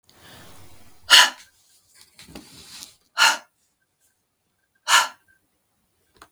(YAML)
exhalation_length: 6.3 s
exhalation_amplitude: 32768
exhalation_signal_mean_std_ratio: 0.24
survey_phase: beta (2021-08-13 to 2022-03-07)
age: 65+
gender: Female
wearing_mask: 'No'
symptom_none: true
smoker_status: Never smoked
respiratory_condition_asthma: false
respiratory_condition_other: false
recruitment_source: REACT
submission_delay: 1 day
covid_test_result: Negative
covid_test_method: RT-qPCR